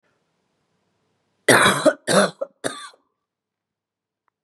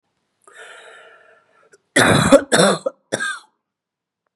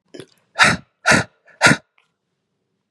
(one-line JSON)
{"three_cough_length": "4.4 s", "three_cough_amplitude": 31016, "three_cough_signal_mean_std_ratio": 0.31, "cough_length": "4.4 s", "cough_amplitude": 32767, "cough_signal_mean_std_ratio": 0.36, "exhalation_length": "2.9 s", "exhalation_amplitude": 32768, "exhalation_signal_mean_std_ratio": 0.33, "survey_phase": "beta (2021-08-13 to 2022-03-07)", "age": "45-64", "gender": "Female", "wearing_mask": "No", "symptom_runny_or_blocked_nose": true, "symptom_fatigue": true, "symptom_onset": "12 days", "smoker_status": "Ex-smoker", "respiratory_condition_asthma": false, "respiratory_condition_other": false, "recruitment_source": "REACT", "submission_delay": "1 day", "covid_test_result": "Negative", "covid_test_method": "RT-qPCR", "influenza_a_test_result": "Negative", "influenza_b_test_result": "Negative"}